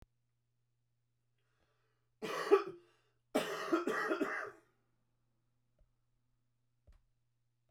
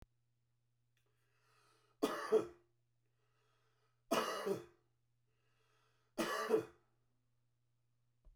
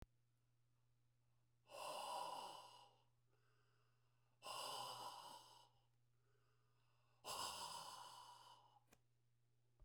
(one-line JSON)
{"cough_length": "7.7 s", "cough_amplitude": 6418, "cough_signal_mean_std_ratio": 0.31, "three_cough_length": "8.4 s", "three_cough_amplitude": 2763, "three_cough_signal_mean_std_ratio": 0.3, "exhalation_length": "9.8 s", "exhalation_amplitude": 465, "exhalation_signal_mean_std_ratio": 0.53, "survey_phase": "beta (2021-08-13 to 2022-03-07)", "age": "65+", "gender": "Male", "wearing_mask": "No", "symptom_none": true, "smoker_status": "Ex-smoker", "respiratory_condition_asthma": false, "respiratory_condition_other": false, "recruitment_source": "REACT", "submission_delay": "1 day", "covid_test_result": "Negative", "covid_test_method": "RT-qPCR"}